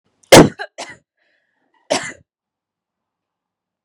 {"three_cough_length": "3.8 s", "three_cough_amplitude": 32768, "three_cough_signal_mean_std_ratio": 0.21, "survey_phase": "beta (2021-08-13 to 2022-03-07)", "age": "18-44", "gender": "Female", "wearing_mask": "No", "symptom_cough_any": true, "symptom_onset": "8 days", "smoker_status": "Never smoked", "respiratory_condition_asthma": false, "respiratory_condition_other": false, "recruitment_source": "REACT", "submission_delay": "2 days", "covid_test_result": "Negative", "covid_test_method": "RT-qPCR", "influenza_a_test_result": "Unknown/Void", "influenza_b_test_result": "Unknown/Void"}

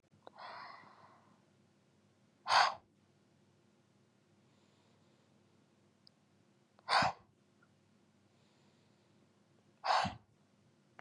{"exhalation_length": "11.0 s", "exhalation_amplitude": 5423, "exhalation_signal_mean_std_ratio": 0.24, "survey_phase": "beta (2021-08-13 to 2022-03-07)", "age": "18-44", "gender": "Female", "wearing_mask": "No", "symptom_runny_or_blocked_nose": true, "symptom_onset": "4 days", "smoker_status": "Ex-smoker", "respiratory_condition_asthma": false, "respiratory_condition_other": false, "recruitment_source": "Test and Trace", "submission_delay": "2 days", "covid_test_result": "Positive", "covid_test_method": "RT-qPCR", "covid_ct_value": 20.3, "covid_ct_gene": "N gene"}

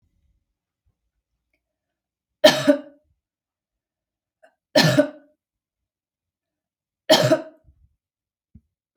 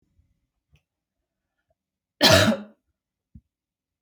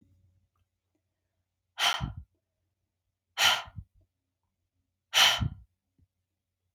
{"three_cough_length": "9.0 s", "three_cough_amplitude": 32190, "three_cough_signal_mean_std_ratio": 0.24, "cough_length": "4.0 s", "cough_amplitude": 25158, "cough_signal_mean_std_ratio": 0.24, "exhalation_length": "6.7 s", "exhalation_amplitude": 14279, "exhalation_signal_mean_std_ratio": 0.27, "survey_phase": "beta (2021-08-13 to 2022-03-07)", "age": "18-44", "gender": "Female", "wearing_mask": "No", "symptom_none": true, "smoker_status": "Never smoked", "respiratory_condition_asthma": false, "respiratory_condition_other": false, "recruitment_source": "REACT", "submission_delay": "2 days", "covid_test_result": "Negative", "covid_test_method": "RT-qPCR", "influenza_a_test_result": "Negative", "influenza_b_test_result": "Negative"}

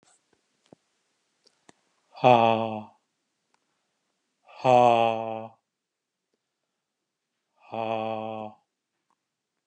{"exhalation_length": "9.7 s", "exhalation_amplitude": 20291, "exhalation_signal_mean_std_ratio": 0.28, "survey_phase": "beta (2021-08-13 to 2022-03-07)", "age": "45-64", "gender": "Male", "wearing_mask": "No", "symptom_sore_throat": true, "smoker_status": "Never smoked", "respiratory_condition_asthma": false, "respiratory_condition_other": true, "recruitment_source": "REACT", "submission_delay": "2 days", "covid_test_result": "Negative", "covid_test_method": "RT-qPCR", "influenza_a_test_result": "Negative", "influenza_b_test_result": "Negative"}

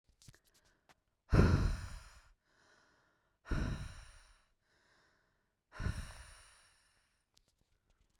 {"exhalation_length": "8.2 s", "exhalation_amplitude": 6495, "exhalation_signal_mean_std_ratio": 0.29, "survey_phase": "beta (2021-08-13 to 2022-03-07)", "age": "18-44", "gender": "Female", "wearing_mask": "No", "symptom_sore_throat": true, "smoker_status": "Current smoker (e-cigarettes or vapes only)", "respiratory_condition_asthma": false, "respiratory_condition_other": false, "recruitment_source": "REACT", "submission_delay": "1 day", "covid_test_result": "Positive", "covid_test_method": "RT-qPCR", "covid_ct_value": 36.0, "covid_ct_gene": "N gene", "influenza_a_test_result": "Negative", "influenza_b_test_result": "Negative"}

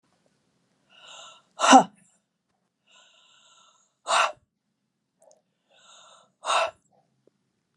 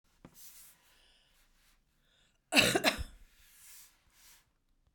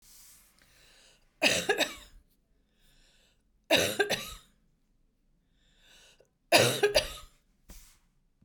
{"exhalation_length": "7.8 s", "exhalation_amplitude": 29243, "exhalation_signal_mean_std_ratio": 0.21, "cough_length": "4.9 s", "cough_amplitude": 11188, "cough_signal_mean_std_ratio": 0.25, "three_cough_length": "8.4 s", "three_cough_amplitude": 15029, "three_cough_signal_mean_std_ratio": 0.32, "survey_phase": "beta (2021-08-13 to 2022-03-07)", "age": "65+", "gender": "Female", "wearing_mask": "No", "symptom_runny_or_blocked_nose": true, "symptom_shortness_of_breath": true, "symptom_onset": "12 days", "smoker_status": "Never smoked", "respiratory_condition_asthma": false, "respiratory_condition_other": false, "recruitment_source": "REACT", "submission_delay": "1 day", "covid_test_result": "Negative", "covid_test_method": "RT-qPCR"}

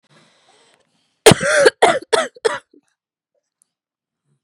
{"cough_length": "4.4 s", "cough_amplitude": 32768, "cough_signal_mean_std_ratio": 0.3, "survey_phase": "beta (2021-08-13 to 2022-03-07)", "age": "18-44", "gender": "Female", "wearing_mask": "No", "symptom_cough_any": true, "symptom_runny_or_blocked_nose": true, "symptom_sore_throat": true, "symptom_fever_high_temperature": true, "symptom_headache": true, "smoker_status": "Never smoked", "respiratory_condition_asthma": false, "respiratory_condition_other": false, "recruitment_source": "Test and Trace", "submission_delay": "29 days", "covid_test_result": "Negative", "covid_test_method": "RT-qPCR"}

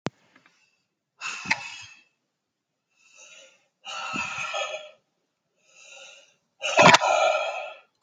{"exhalation_length": "8.0 s", "exhalation_amplitude": 29784, "exhalation_signal_mean_std_ratio": 0.33, "survey_phase": "alpha (2021-03-01 to 2021-08-12)", "age": "18-44", "gender": "Male", "wearing_mask": "No", "symptom_none": true, "smoker_status": "Never smoked", "respiratory_condition_asthma": false, "respiratory_condition_other": false, "recruitment_source": "REACT", "submission_delay": "2 days", "covid_test_result": "Negative", "covid_test_method": "RT-qPCR"}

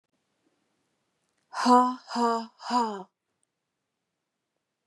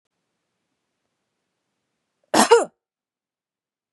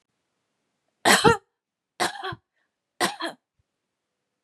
{"exhalation_length": "4.9 s", "exhalation_amplitude": 17030, "exhalation_signal_mean_std_ratio": 0.32, "cough_length": "3.9 s", "cough_amplitude": 30910, "cough_signal_mean_std_ratio": 0.2, "three_cough_length": "4.4 s", "three_cough_amplitude": 23511, "three_cough_signal_mean_std_ratio": 0.28, "survey_phase": "beta (2021-08-13 to 2022-03-07)", "age": "45-64", "gender": "Female", "wearing_mask": "No", "symptom_none": true, "symptom_onset": "3 days", "smoker_status": "Never smoked", "respiratory_condition_asthma": true, "respiratory_condition_other": false, "recruitment_source": "Test and Trace", "submission_delay": "2 days", "covid_test_result": "Negative", "covid_test_method": "RT-qPCR"}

